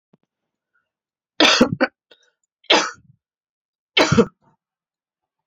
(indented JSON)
{
  "three_cough_length": "5.5 s",
  "three_cough_amplitude": 31399,
  "three_cough_signal_mean_std_ratio": 0.29,
  "survey_phase": "beta (2021-08-13 to 2022-03-07)",
  "age": "45-64",
  "gender": "Female",
  "wearing_mask": "No",
  "symptom_cough_any": true,
  "symptom_runny_or_blocked_nose": true,
  "symptom_sore_throat": true,
  "symptom_fatigue": true,
  "symptom_headache": true,
  "symptom_change_to_sense_of_smell_or_taste": true,
  "symptom_loss_of_taste": true,
  "symptom_other": true,
  "symptom_onset": "5 days",
  "smoker_status": "Never smoked",
  "respiratory_condition_asthma": false,
  "respiratory_condition_other": false,
  "recruitment_source": "Test and Trace",
  "submission_delay": "2 days",
  "covid_test_result": "Positive",
  "covid_test_method": "RT-qPCR",
  "covid_ct_value": 14.8,
  "covid_ct_gene": "ORF1ab gene",
  "covid_ct_mean": 15.8,
  "covid_viral_load": "6500000 copies/ml",
  "covid_viral_load_category": "High viral load (>1M copies/ml)"
}